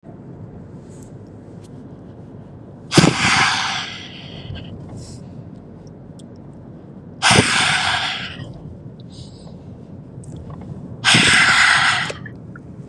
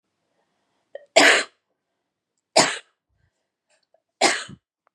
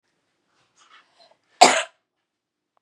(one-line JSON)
{"exhalation_length": "12.9 s", "exhalation_amplitude": 32768, "exhalation_signal_mean_std_ratio": 0.52, "three_cough_length": "4.9 s", "three_cough_amplitude": 28871, "three_cough_signal_mean_std_ratio": 0.27, "cough_length": "2.8 s", "cough_amplitude": 32768, "cough_signal_mean_std_ratio": 0.19, "survey_phase": "beta (2021-08-13 to 2022-03-07)", "age": "18-44", "gender": "Female", "wearing_mask": "No", "symptom_none": true, "symptom_onset": "3 days", "smoker_status": "Never smoked", "respiratory_condition_asthma": false, "respiratory_condition_other": false, "recruitment_source": "REACT", "submission_delay": "2 days", "covid_test_result": "Negative", "covid_test_method": "RT-qPCR", "influenza_a_test_result": "Unknown/Void", "influenza_b_test_result": "Unknown/Void"}